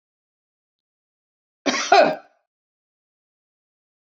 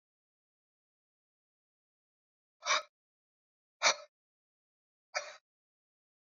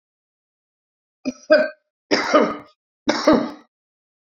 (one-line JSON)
{"cough_length": "4.0 s", "cough_amplitude": 26313, "cough_signal_mean_std_ratio": 0.24, "exhalation_length": "6.3 s", "exhalation_amplitude": 7005, "exhalation_signal_mean_std_ratio": 0.18, "three_cough_length": "4.3 s", "three_cough_amplitude": 26138, "three_cough_signal_mean_std_ratio": 0.36, "survey_phase": "beta (2021-08-13 to 2022-03-07)", "age": "65+", "gender": "Female", "wearing_mask": "No", "symptom_none": true, "smoker_status": "Never smoked", "respiratory_condition_asthma": false, "respiratory_condition_other": false, "recruitment_source": "REACT", "submission_delay": "2 days", "covid_test_result": "Negative", "covid_test_method": "RT-qPCR", "influenza_a_test_result": "Negative", "influenza_b_test_result": "Negative"}